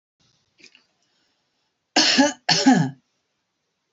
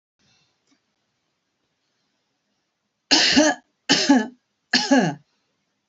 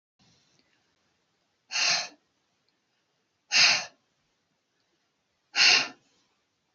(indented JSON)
{
  "cough_length": "3.9 s",
  "cough_amplitude": 26059,
  "cough_signal_mean_std_ratio": 0.35,
  "three_cough_length": "5.9 s",
  "three_cough_amplitude": 25456,
  "three_cough_signal_mean_std_ratio": 0.35,
  "exhalation_length": "6.7 s",
  "exhalation_amplitude": 16532,
  "exhalation_signal_mean_std_ratio": 0.28,
  "survey_phase": "beta (2021-08-13 to 2022-03-07)",
  "age": "65+",
  "gender": "Female",
  "wearing_mask": "No",
  "symptom_none": true,
  "smoker_status": "Ex-smoker",
  "respiratory_condition_asthma": false,
  "respiratory_condition_other": false,
  "recruitment_source": "REACT",
  "submission_delay": "3 days",
  "covid_test_result": "Negative",
  "covid_test_method": "RT-qPCR",
  "influenza_a_test_result": "Negative",
  "influenza_b_test_result": "Negative"
}